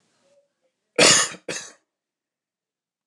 cough_length: 3.1 s
cough_amplitude: 28661
cough_signal_mean_std_ratio: 0.27
survey_phase: beta (2021-08-13 to 2022-03-07)
age: 45-64
gender: Male
wearing_mask: 'No'
symptom_none: true
symptom_onset: 12 days
smoker_status: Never smoked
respiratory_condition_asthma: true
respiratory_condition_other: false
recruitment_source: REACT
submission_delay: 1 day
covid_test_result: Negative
covid_test_method: RT-qPCR
influenza_a_test_result: Negative
influenza_b_test_result: Negative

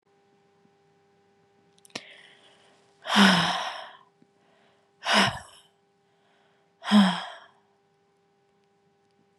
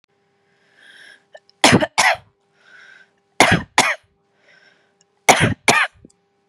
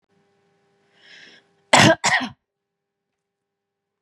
exhalation_length: 9.4 s
exhalation_amplitude: 19756
exhalation_signal_mean_std_ratio: 0.29
three_cough_length: 6.5 s
three_cough_amplitude: 32768
three_cough_signal_mean_std_ratio: 0.33
cough_length: 4.0 s
cough_amplitude: 32767
cough_signal_mean_std_ratio: 0.25
survey_phase: beta (2021-08-13 to 2022-03-07)
age: 18-44
gender: Female
wearing_mask: 'No'
symptom_none: true
smoker_status: Never smoked
respiratory_condition_asthma: false
respiratory_condition_other: false
recruitment_source: REACT
submission_delay: 1 day
covid_test_result: Negative
covid_test_method: RT-qPCR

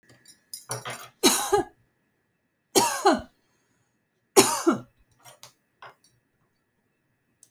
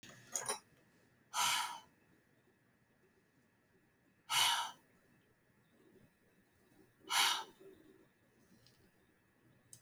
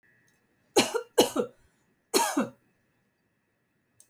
three_cough_length: 7.5 s
three_cough_amplitude: 28463
three_cough_signal_mean_std_ratio: 0.3
exhalation_length: 9.8 s
exhalation_amplitude: 3750
exhalation_signal_mean_std_ratio: 0.32
cough_length: 4.1 s
cough_amplitude: 16133
cough_signal_mean_std_ratio: 0.31
survey_phase: alpha (2021-03-01 to 2021-08-12)
age: 45-64
gender: Female
wearing_mask: 'No'
symptom_cough_any: true
symptom_fatigue: true
smoker_status: Prefer not to say
respiratory_condition_asthma: false
respiratory_condition_other: true
recruitment_source: REACT
submission_delay: 6 days
covid_test_result: Negative
covid_test_method: RT-qPCR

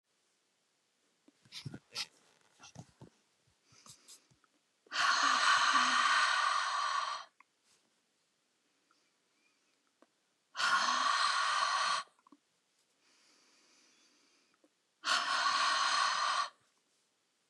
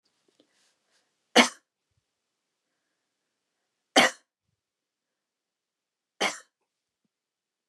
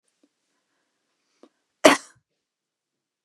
exhalation_length: 17.5 s
exhalation_amplitude: 5224
exhalation_signal_mean_std_ratio: 0.48
three_cough_length: 7.7 s
three_cough_amplitude: 26385
three_cough_signal_mean_std_ratio: 0.16
cough_length: 3.2 s
cough_amplitude: 32768
cough_signal_mean_std_ratio: 0.14
survey_phase: beta (2021-08-13 to 2022-03-07)
age: 65+
gender: Female
wearing_mask: 'No'
symptom_none: true
smoker_status: Never smoked
respiratory_condition_asthma: false
respiratory_condition_other: false
recruitment_source: REACT
submission_delay: 2 days
covid_test_result: Negative
covid_test_method: RT-qPCR
influenza_a_test_result: Negative
influenza_b_test_result: Negative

